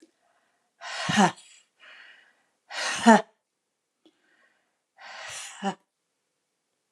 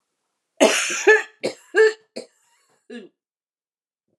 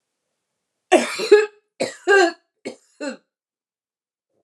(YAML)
exhalation_length: 6.9 s
exhalation_amplitude: 26428
exhalation_signal_mean_std_ratio: 0.24
cough_length: 4.2 s
cough_amplitude: 30085
cough_signal_mean_std_ratio: 0.33
three_cough_length: 4.4 s
three_cough_amplitude: 31173
three_cough_signal_mean_std_ratio: 0.32
survey_phase: alpha (2021-03-01 to 2021-08-12)
age: 65+
gender: Female
wearing_mask: 'No'
symptom_none: true
smoker_status: Never smoked
respiratory_condition_asthma: false
respiratory_condition_other: false
recruitment_source: REACT
submission_delay: 1 day
covid_test_result: Negative
covid_test_method: RT-qPCR